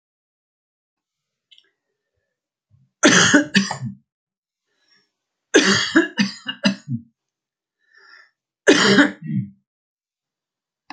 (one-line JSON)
{"three_cough_length": "10.9 s", "three_cough_amplitude": 32731, "three_cough_signal_mean_std_ratio": 0.33, "survey_phase": "alpha (2021-03-01 to 2021-08-12)", "age": "65+", "gender": "Male", "wearing_mask": "No", "symptom_none": true, "smoker_status": "Never smoked", "respiratory_condition_asthma": false, "respiratory_condition_other": false, "recruitment_source": "REACT", "submission_delay": "2 days", "covid_test_result": "Negative", "covid_test_method": "RT-qPCR"}